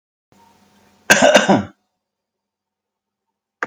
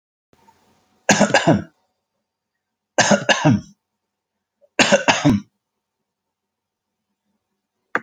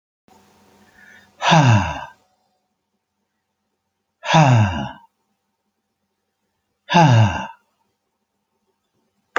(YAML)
cough_length: 3.7 s
cough_amplitude: 32768
cough_signal_mean_std_ratio: 0.29
three_cough_length: 8.0 s
three_cough_amplitude: 32649
three_cough_signal_mean_std_ratio: 0.33
exhalation_length: 9.4 s
exhalation_amplitude: 32767
exhalation_signal_mean_std_ratio: 0.34
survey_phase: alpha (2021-03-01 to 2021-08-12)
age: 45-64
gender: Male
wearing_mask: 'No'
symptom_none: true
smoker_status: Never smoked
respiratory_condition_asthma: false
respiratory_condition_other: false
recruitment_source: REACT
submission_delay: 1 day
covid_test_result: Negative
covid_test_method: RT-qPCR